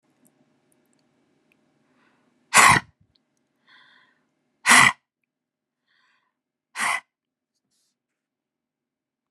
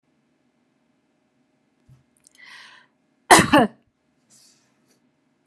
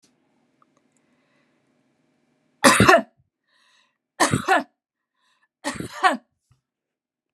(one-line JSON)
{"exhalation_length": "9.3 s", "exhalation_amplitude": 31685, "exhalation_signal_mean_std_ratio": 0.2, "cough_length": "5.5 s", "cough_amplitude": 32768, "cough_signal_mean_std_ratio": 0.19, "three_cough_length": "7.3 s", "three_cough_amplitude": 32767, "three_cough_signal_mean_std_ratio": 0.27, "survey_phase": "beta (2021-08-13 to 2022-03-07)", "age": "45-64", "gender": "Female", "wearing_mask": "No", "symptom_none": true, "smoker_status": "Never smoked", "respiratory_condition_asthma": false, "respiratory_condition_other": false, "recruitment_source": "REACT", "submission_delay": "2 days", "covid_test_result": "Negative", "covid_test_method": "RT-qPCR"}